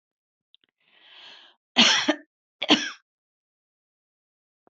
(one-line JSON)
{"cough_length": "4.7 s", "cough_amplitude": 22840, "cough_signal_mean_std_ratio": 0.26, "survey_phase": "beta (2021-08-13 to 2022-03-07)", "age": "45-64", "gender": "Female", "wearing_mask": "No", "symptom_none": true, "smoker_status": "Ex-smoker", "respiratory_condition_asthma": false, "respiratory_condition_other": false, "recruitment_source": "REACT", "submission_delay": "3 days", "covid_test_result": "Negative", "covid_test_method": "RT-qPCR"}